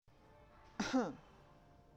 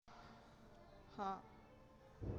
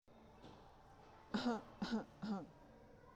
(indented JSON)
{
  "cough_length": "2.0 s",
  "cough_amplitude": 2205,
  "cough_signal_mean_std_ratio": 0.39,
  "exhalation_length": "2.4 s",
  "exhalation_amplitude": 705,
  "exhalation_signal_mean_std_ratio": 0.58,
  "three_cough_length": "3.2 s",
  "three_cough_amplitude": 1158,
  "three_cough_signal_mean_std_ratio": 0.51,
  "survey_phase": "beta (2021-08-13 to 2022-03-07)",
  "age": "18-44",
  "gender": "Female",
  "wearing_mask": "No",
  "symptom_none": true,
  "smoker_status": "Never smoked",
  "respiratory_condition_asthma": false,
  "respiratory_condition_other": false,
  "recruitment_source": "REACT",
  "submission_delay": "6 days",
  "covid_test_result": "Negative",
  "covid_test_method": "RT-qPCR",
  "influenza_a_test_result": "Negative",
  "influenza_b_test_result": "Negative"
}